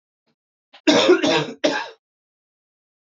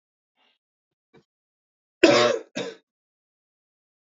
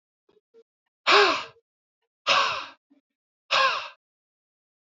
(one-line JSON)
{"three_cough_length": "3.1 s", "three_cough_amplitude": 26376, "three_cough_signal_mean_std_ratio": 0.4, "cough_length": "4.0 s", "cough_amplitude": 26939, "cough_signal_mean_std_ratio": 0.24, "exhalation_length": "4.9 s", "exhalation_amplitude": 18024, "exhalation_signal_mean_std_ratio": 0.35, "survey_phase": "beta (2021-08-13 to 2022-03-07)", "age": "18-44", "gender": "Male", "wearing_mask": "No", "symptom_cough_any": true, "symptom_runny_or_blocked_nose": true, "smoker_status": "Never smoked", "respiratory_condition_asthma": false, "respiratory_condition_other": false, "recruitment_source": "Test and Trace", "submission_delay": "1 day", "covid_test_result": "Positive", "covid_test_method": "RT-qPCR", "covid_ct_value": 29.4, "covid_ct_gene": "N gene"}